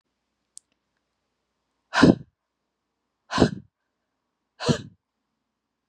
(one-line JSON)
{"exhalation_length": "5.9 s", "exhalation_amplitude": 26406, "exhalation_signal_mean_std_ratio": 0.21, "survey_phase": "beta (2021-08-13 to 2022-03-07)", "age": "18-44", "gender": "Female", "wearing_mask": "No", "symptom_cough_any": true, "symptom_shortness_of_breath": true, "symptom_sore_throat": true, "symptom_headache": true, "symptom_onset": "1 day", "smoker_status": "Never smoked", "respiratory_condition_asthma": true, "respiratory_condition_other": false, "recruitment_source": "Test and Trace", "submission_delay": "1 day", "covid_test_result": "Positive", "covid_test_method": "RT-qPCR", "covid_ct_value": 36.8, "covid_ct_gene": "N gene"}